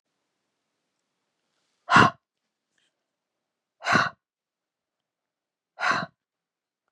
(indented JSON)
{
  "exhalation_length": "6.9 s",
  "exhalation_amplitude": 29737,
  "exhalation_signal_mean_std_ratio": 0.22,
  "survey_phase": "beta (2021-08-13 to 2022-03-07)",
  "age": "45-64",
  "gender": "Female",
  "wearing_mask": "No",
  "symptom_none": true,
  "smoker_status": "Never smoked",
  "respiratory_condition_asthma": false,
  "respiratory_condition_other": false,
  "recruitment_source": "REACT",
  "submission_delay": "1 day",
  "covid_test_result": "Negative",
  "covid_test_method": "RT-qPCR",
  "influenza_a_test_result": "Negative",
  "influenza_b_test_result": "Negative"
}